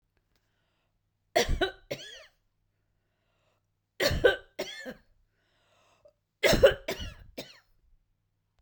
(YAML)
three_cough_length: 8.6 s
three_cough_amplitude: 13412
three_cough_signal_mean_std_ratio: 0.28
survey_phase: beta (2021-08-13 to 2022-03-07)
age: 45-64
gender: Female
wearing_mask: 'No'
symptom_none: true
smoker_status: Never smoked
respiratory_condition_asthma: false
respiratory_condition_other: false
recruitment_source: REACT
submission_delay: 2 days
covid_test_result: Negative
covid_test_method: RT-qPCR